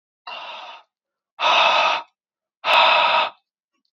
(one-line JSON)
{"exhalation_length": "3.9 s", "exhalation_amplitude": 23495, "exhalation_signal_mean_std_ratio": 0.51, "survey_phase": "beta (2021-08-13 to 2022-03-07)", "age": "18-44", "gender": "Male", "wearing_mask": "No", "symptom_runny_or_blocked_nose": true, "symptom_onset": "2 days", "smoker_status": "Never smoked", "respiratory_condition_asthma": false, "respiratory_condition_other": false, "recruitment_source": "REACT", "submission_delay": "4 days", "covid_test_result": "Positive", "covid_test_method": "RT-qPCR", "covid_ct_value": 28.5, "covid_ct_gene": "E gene", "influenza_a_test_result": "Negative", "influenza_b_test_result": "Negative"}